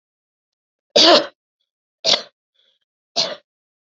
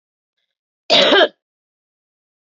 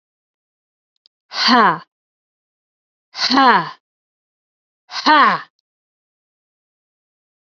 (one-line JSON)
{"three_cough_length": "3.9 s", "three_cough_amplitude": 32768, "three_cough_signal_mean_std_ratio": 0.28, "cough_length": "2.6 s", "cough_amplitude": 31147, "cough_signal_mean_std_ratio": 0.31, "exhalation_length": "7.6 s", "exhalation_amplitude": 31672, "exhalation_signal_mean_std_ratio": 0.32, "survey_phase": "beta (2021-08-13 to 2022-03-07)", "age": "18-44", "gender": "Female", "wearing_mask": "No", "symptom_cough_any": true, "symptom_shortness_of_breath": true, "symptom_sore_throat": true, "symptom_headache": true, "symptom_onset": "2 days", "smoker_status": "Never smoked", "respiratory_condition_asthma": false, "respiratory_condition_other": false, "recruitment_source": "Test and Trace", "submission_delay": "1 day", "covid_test_result": "Negative", "covid_test_method": "RT-qPCR"}